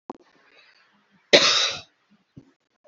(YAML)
cough_length: 2.9 s
cough_amplitude: 27678
cough_signal_mean_std_ratio: 0.28
survey_phase: beta (2021-08-13 to 2022-03-07)
age: 45-64
gender: Female
wearing_mask: 'No'
symptom_none: true
smoker_status: Ex-smoker
respiratory_condition_asthma: false
respiratory_condition_other: false
recruitment_source: REACT
submission_delay: 12 days
covid_test_result: Negative
covid_test_method: RT-qPCR
influenza_a_test_result: Negative
influenza_b_test_result: Negative